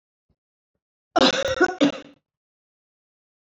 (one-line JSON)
{"cough_length": "3.4 s", "cough_amplitude": 22996, "cough_signal_mean_std_ratio": 0.32, "survey_phase": "beta (2021-08-13 to 2022-03-07)", "age": "65+", "gender": "Female", "wearing_mask": "No", "symptom_none": true, "smoker_status": "Ex-smoker", "respiratory_condition_asthma": false, "respiratory_condition_other": false, "recruitment_source": "REACT", "submission_delay": "0 days", "covid_test_result": "Negative", "covid_test_method": "RT-qPCR"}